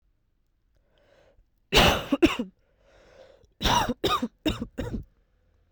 {
  "three_cough_length": "5.7 s",
  "three_cough_amplitude": 17797,
  "three_cough_signal_mean_std_ratio": 0.37,
  "survey_phase": "beta (2021-08-13 to 2022-03-07)",
  "age": "18-44",
  "gender": "Female",
  "wearing_mask": "No",
  "symptom_cough_any": true,
  "symptom_runny_or_blocked_nose": true,
  "symptom_sore_throat": true,
  "symptom_fatigue": true,
  "symptom_headache": true,
  "symptom_other": true,
  "smoker_status": "Never smoked",
  "respiratory_condition_asthma": false,
  "respiratory_condition_other": false,
  "recruitment_source": "Test and Trace",
  "submission_delay": "2 days",
  "covid_test_result": "Positive",
  "covid_test_method": "ePCR"
}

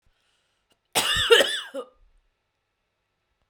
{
  "cough_length": "3.5 s",
  "cough_amplitude": 30424,
  "cough_signal_mean_std_ratio": 0.31,
  "survey_phase": "beta (2021-08-13 to 2022-03-07)",
  "age": "45-64",
  "gender": "Female",
  "wearing_mask": "No",
  "symptom_none": true,
  "smoker_status": "Never smoked",
  "respiratory_condition_asthma": true,
  "respiratory_condition_other": false,
  "recruitment_source": "REACT",
  "submission_delay": "-1 day",
  "covid_test_result": "Negative",
  "covid_test_method": "RT-qPCR",
  "influenza_a_test_result": "Negative",
  "influenza_b_test_result": "Negative"
}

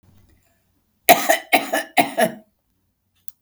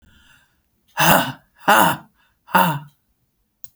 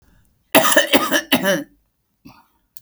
{
  "three_cough_length": "3.4 s",
  "three_cough_amplitude": 32768,
  "three_cough_signal_mean_std_ratio": 0.33,
  "exhalation_length": "3.8 s",
  "exhalation_amplitude": 32767,
  "exhalation_signal_mean_std_ratio": 0.38,
  "cough_length": "2.8 s",
  "cough_amplitude": 32768,
  "cough_signal_mean_std_ratio": 0.43,
  "survey_phase": "beta (2021-08-13 to 2022-03-07)",
  "age": "65+",
  "gender": "Female",
  "wearing_mask": "No",
  "symptom_none": true,
  "smoker_status": "Ex-smoker",
  "respiratory_condition_asthma": false,
  "respiratory_condition_other": false,
  "recruitment_source": "REACT",
  "submission_delay": "1 day",
  "covid_test_result": "Negative",
  "covid_test_method": "RT-qPCR"
}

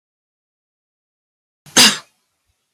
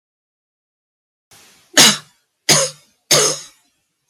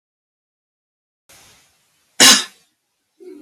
{
  "exhalation_length": "2.7 s",
  "exhalation_amplitude": 32767,
  "exhalation_signal_mean_std_ratio": 0.21,
  "three_cough_length": "4.1 s",
  "three_cough_amplitude": 32768,
  "three_cough_signal_mean_std_ratio": 0.32,
  "cough_length": "3.4 s",
  "cough_amplitude": 32767,
  "cough_signal_mean_std_ratio": 0.22,
  "survey_phase": "beta (2021-08-13 to 2022-03-07)",
  "age": "65+",
  "gender": "Female",
  "wearing_mask": "No",
  "symptom_cough_any": true,
  "symptom_new_continuous_cough": true,
  "symptom_runny_or_blocked_nose": true,
  "symptom_fatigue": true,
  "symptom_change_to_sense_of_smell_or_taste": true,
  "symptom_loss_of_taste": true,
  "smoker_status": "Never smoked",
  "respiratory_condition_asthma": false,
  "respiratory_condition_other": false,
  "recruitment_source": "Test and Trace",
  "submission_delay": "1 day",
  "covid_test_result": "Negative",
  "covid_test_method": "LFT"
}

